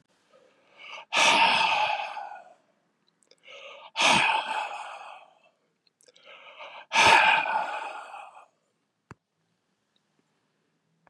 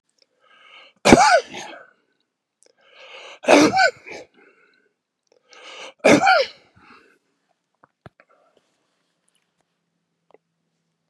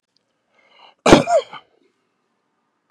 {"exhalation_length": "11.1 s", "exhalation_amplitude": 15748, "exhalation_signal_mean_std_ratio": 0.41, "three_cough_length": "11.1 s", "three_cough_amplitude": 32768, "three_cough_signal_mean_std_ratio": 0.27, "cough_length": "2.9 s", "cough_amplitude": 32768, "cough_signal_mean_std_ratio": 0.25, "survey_phase": "beta (2021-08-13 to 2022-03-07)", "age": "65+", "gender": "Male", "wearing_mask": "No", "symptom_cough_any": true, "symptom_runny_or_blocked_nose": true, "symptom_fatigue": true, "symptom_onset": "6 days", "smoker_status": "Current smoker (e-cigarettes or vapes only)", "respiratory_condition_asthma": false, "respiratory_condition_other": false, "recruitment_source": "Test and Trace", "submission_delay": "2 days", "covid_test_result": "Positive", "covid_test_method": "RT-qPCR", "covid_ct_value": 21.5, "covid_ct_gene": "ORF1ab gene"}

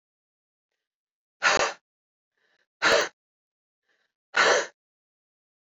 {"exhalation_length": "5.6 s", "exhalation_amplitude": 12917, "exhalation_signal_mean_std_ratio": 0.3, "survey_phase": "beta (2021-08-13 to 2022-03-07)", "age": "45-64", "gender": "Female", "wearing_mask": "Yes", "symptom_cough_any": true, "symptom_runny_or_blocked_nose": true, "symptom_sore_throat": true, "smoker_status": "Ex-smoker", "respiratory_condition_asthma": false, "respiratory_condition_other": false, "recruitment_source": "Test and Trace", "submission_delay": "2 days", "covid_test_result": "Positive", "covid_test_method": "LFT"}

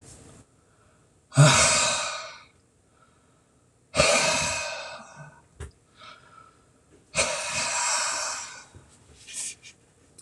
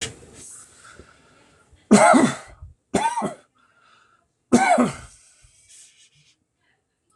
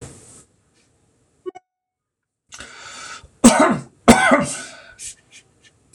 {"exhalation_length": "10.2 s", "exhalation_amplitude": 18577, "exhalation_signal_mean_std_ratio": 0.43, "three_cough_length": "7.2 s", "three_cough_amplitude": 25924, "three_cough_signal_mean_std_ratio": 0.33, "cough_length": "5.9 s", "cough_amplitude": 26028, "cough_signal_mean_std_ratio": 0.3, "survey_phase": "beta (2021-08-13 to 2022-03-07)", "age": "45-64", "gender": "Male", "wearing_mask": "No", "symptom_none": true, "smoker_status": "Ex-smoker", "respiratory_condition_asthma": false, "respiratory_condition_other": false, "recruitment_source": "REACT", "submission_delay": "1 day", "covid_test_result": "Negative", "covid_test_method": "RT-qPCR"}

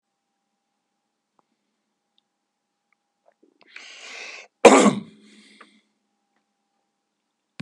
{"cough_length": "7.6 s", "cough_amplitude": 32768, "cough_signal_mean_std_ratio": 0.17, "survey_phase": "beta (2021-08-13 to 2022-03-07)", "age": "65+", "gender": "Male", "wearing_mask": "No", "symptom_none": true, "smoker_status": "Never smoked", "respiratory_condition_asthma": false, "respiratory_condition_other": false, "recruitment_source": "REACT", "submission_delay": "3 days", "covid_test_result": "Negative", "covid_test_method": "RT-qPCR", "influenza_a_test_result": "Negative", "influenza_b_test_result": "Negative"}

